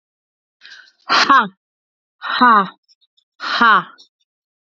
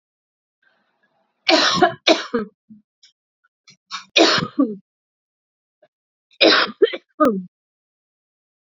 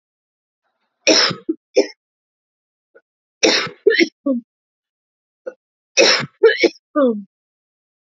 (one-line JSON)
{"exhalation_length": "4.8 s", "exhalation_amplitude": 32430, "exhalation_signal_mean_std_ratio": 0.38, "three_cough_length": "8.7 s", "three_cough_amplitude": 32638, "three_cough_signal_mean_std_ratio": 0.34, "cough_length": "8.1 s", "cough_amplitude": 32767, "cough_signal_mean_std_ratio": 0.36, "survey_phase": "beta (2021-08-13 to 2022-03-07)", "age": "45-64", "gender": "Female", "wearing_mask": "No", "symptom_cough_any": true, "symptom_runny_or_blocked_nose": true, "symptom_sore_throat": true, "symptom_fatigue": true, "symptom_headache": true, "smoker_status": "Ex-smoker", "respiratory_condition_asthma": false, "respiratory_condition_other": false, "recruitment_source": "Test and Trace", "submission_delay": "1 day", "covid_test_result": "Positive", "covid_test_method": "RT-qPCR"}